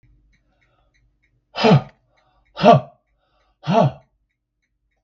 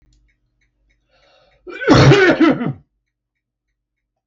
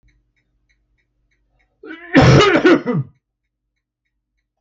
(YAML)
exhalation_length: 5.0 s
exhalation_amplitude: 32768
exhalation_signal_mean_std_ratio: 0.29
cough_length: 4.3 s
cough_amplitude: 32768
cough_signal_mean_std_ratio: 0.36
three_cough_length: 4.6 s
three_cough_amplitude: 32768
three_cough_signal_mean_std_ratio: 0.34
survey_phase: beta (2021-08-13 to 2022-03-07)
age: 65+
gender: Male
wearing_mask: 'No'
symptom_none: true
smoker_status: Never smoked
respiratory_condition_asthma: false
respiratory_condition_other: false
recruitment_source: REACT
submission_delay: 1 day
covid_test_result: Negative
covid_test_method: RT-qPCR
influenza_a_test_result: Negative
influenza_b_test_result: Negative